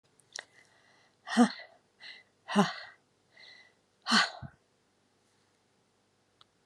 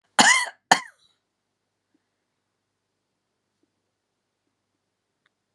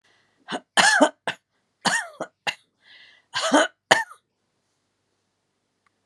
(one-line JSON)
{"exhalation_length": "6.7 s", "exhalation_amplitude": 10372, "exhalation_signal_mean_std_ratio": 0.25, "cough_length": "5.5 s", "cough_amplitude": 32361, "cough_signal_mean_std_ratio": 0.18, "three_cough_length": "6.1 s", "three_cough_amplitude": 32688, "three_cough_signal_mean_std_ratio": 0.32, "survey_phase": "alpha (2021-03-01 to 2021-08-12)", "age": "45-64", "gender": "Female", "wearing_mask": "No", "symptom_abdominal_pain": true, "smoker_status": "Ex-smoker", "respiratory_condition_asthma": false, "respiratory_condition_other": false, "recruitment_source": "REACT", "submission_delay": "5 days", "covid_test_result": "Negative", "covid_test_method": "RT-qPCR"}